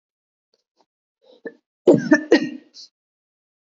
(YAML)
cough_length: 3.8 s
cough_amplitude: 26593
cough_signal_mean_std_ratio: 0.25
survey_phase: beta (2021-08-13 to 2022-03-07)
age: 18-44
gender: Female
wearing_mask: 'No'
symptom_cough_any: true
symptom_runny_or_blocked_nose: true
symptom_shortness_of_breath: true
symptom_fatigue: true
smoker_status: Never smoked
respiratory_condition_asthma: false
respiratory_condition_other: false
recruitment_source: Test and Trace
submission_delay: 1 day
covid_test_result: Positive
covid_test_method: LFT